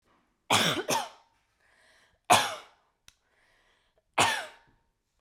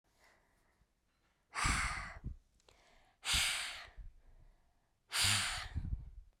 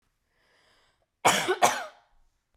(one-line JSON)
{"three_cough_length": "5.2 s", "three_cough_amplitude": 16526, "three_cough_signal_mean_std_ratio": 0.33, "exhalation_length": "6.4 s", "exhalation_amplitude": 3519, "exhalation_signal_mean_std_ratio": 0.48, "cough_length": "2.6 s", "cough_amplitude": 16368, "cough_signal_mean_std_ratio": 0.33, "survey_phase": "beta (2021-08-13 to 2022-03-07)", "age": "18-44", "gender": "Female", "wearing_mask": "No", "symptom_none": true, "smoker_status": "Ex-smoker", "respiratory_condition_asthma": true, "respiratory_condition_other": false, "recruitment_source": "REACT", "submission_delay": "1 day", "covid_test_result": "Negative", "covid_test_method": "RT-qPCR"}